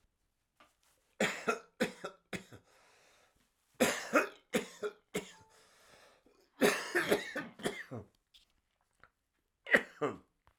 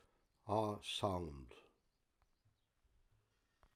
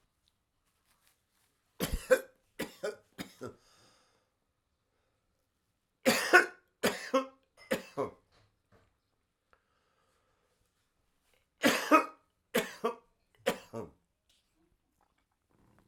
{"cough_length": "10.6 s", "cough_amplitude": 9883, "cough_signal_mean_std_ratio": 0.34, "exhalation_length": "3.8 s", "exhalation_amplitude": 2307, "exhalation_signal_mean_std_ratio": 0.37, "three_cough_length": "15.9 s", "three_cough_amplitude": 17306, "three_cough_signal_mean_std_ratio": 0.25, "survey_phase": "alpha (2021-03-01 to 2021-08-12)", "age": "65+", "gender": "Male", "wearing_mask": "Yes", "symptom_cough_any": true, "symptom_onset": "3 days", "smoker_status": "Ex-smoker", "respiratory_condition_asthma": false, "respiratory_condition_other": false, "recruitment_source": "Test and Trace", "submission_delay": "1 day", "covid_test_result": "Positive", "covid_test_method": "RT-qPCR", "covid_ct_value": 27.3, "covid_ct_gene": "ORF1ab gene"}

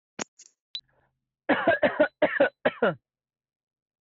{"cough_length": "4.0 s", "cough_amplitude": 9507, "cough_signal_mean_std_ratio": 0.38, "survey_phase": "beta (2021-08-13 to 2022-03-07)", "age": "18-44", "gender": "Male", "wearing_mask": "No", "symptom_none": true, "smoker_status": "Never smoked", "respiratory_condition_asthma": false, "respiratory_condition_other": false, "recruitment_source": "REACT", "submission_delay": "3 days", "covid_test_result": "Negative", "covid_test_method": "RT-qPCR"}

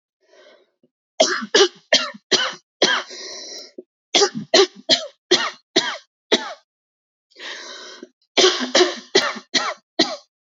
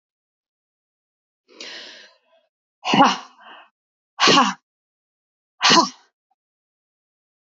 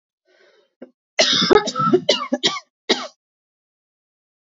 {"three_cough_length": "10.6 s", "three_cough_amplitude": 28800, "three_cough_signal_mean_std_ratio": 0.41, "exhalation_length": "7.6 s", "exhalation_amplitude": 26585, "exhalation_signal_mean_std_ratio": 0.27, "cough_length": "4.4 s", "cough_amplitude": 27634, "cough_signal_mean_std_ratio": 0.39, "survey_phase": "beta (2021-08-13 to 2022-03-07)", "age": "45-64", "gender": "Female", "wearing_mask": "No", "symptom_cough_any": true, "symptom_new_continuous_cough": true, "symptom_shortness_of_breath": true, "symptom_sore_throat": true, "symptom_fatigue": true, "symptom_change_to_sense_of_smell_or_taste": true, "symptom_onset": "4 days", "smoker_status": "Ex-smoker", "respiratory_condition_asthma": false, "respiratory_condition_other": false, "recruitment_source": "Test and Trace", "submission_delay": "1 day", "covid_test_result": "Positive", "covid_test_method": "RT-qPCR", "covid_ct_value": 22.3, "covid_ct_gene": "ORF1ab gene"}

